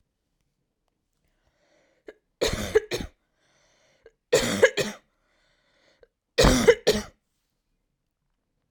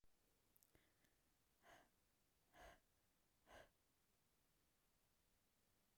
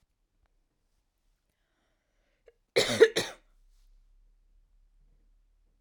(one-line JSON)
{"three_cough_length": "8.7 s", "three_cough_amplitude": 20731, "three_cough_signal_mean_std_ratio": 0.29, "exhalation_length": "6.0 s", "exhalation_amplitude": 105, "exhalation_signal_mean_std_ratio": 0.58, "cough_length": "5.8 s", "cough_amplitude": 16946, "cough_signal_mean_std_ratio": 0.19, "survey_phase": "alpha (2021-03-01 to 2021-08-12)", "age": "18-44", "gender": "Female", "wearing_mask": "No", "symptom_none": true, "symptom_onset": "9 days", "smoker_status": "Never smoked", "respiratory_condition_asthma": false, "respiratory_condition_other": false, "recruitment_source": "REACT", "submission_delay": "1 day", "covid_test_result": "Negative", "covid_test_method": "RT-qPCR"}